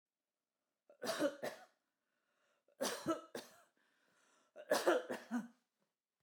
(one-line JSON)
{"cough_length": "6.2 s", "cough_amplitude": 3217, "cough_signal_mean_std_ratio": 0.36, "survey_phase": "beta (2021-08-13 to 2022-03-07)", "age": "45-64", "gender": "Female", "wearing_mask": "No", "symptom_none": true, "smoker_status": "Never smoked", "respiratory_condition_asthma": false, "respiratory_condition_other": false, "recruitment_source": "REACT", "submission_delay": "2 days", "covid_test_result": "Negative", "covid_test_method": "RT-qPCR"}